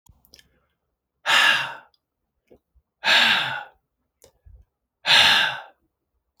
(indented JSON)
{
  "exhalation_length": "6.4 s",
  "exhalation_amplitude": 23985,
  "exhalation_signal_mean_std_ratio": 0.38,
  "survey_phase": "beta (2021-08-13 to 2022-03-07)",
  "age": "45-64",
  "gender": "Male",
  "wearing_mask": "No",
  "symptom_cough_any": true,
  "symptom_runny_or_blocked_nose": true,
  "symptom_shortness_of_breath": true,
  "symptom_sore_throat": true,
  "symptom_fatigue": true,
  "symptom_fever_high_temperature": true,
  "symptom_headache": true,
  "symptom_onset": "3 days",
  "smoker_status": "Ex-smoker",
  "respiratory_condition_asthma": false,
  "respiratory_condition_other": false,
  "recruitment_source": "Test and Trace",
  "submission_delay": "1 day",
  "covid_test_result": "Positive",
  "covid_test_method": "RT-qPCR"
}